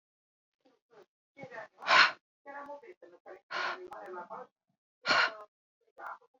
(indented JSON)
{
  "exhalation_length": "6.4 s",
  "exhalation_amplitude": 12074,
  "exhalation_signal_mean_std_ratio": 0.31,
  "survey_phase": "beta (2021-08-13 to 2022-03-07)",
  "age": "45-64",
  "gender": "Female",
  "wearing_mask": "No",
  "symptom_none": true,
  "smoker_status": "Current smoker (1 to 10 cigarettes per day)",
  "respiratory_condition_asthma": false,
  "respiratory_condition_other": false,
  "recruitment_source": "REACT",
  "submission_delay": "1 day",
  "covid_test_result": "Negative",
  "covid_test_method": "RT-qPCR"
}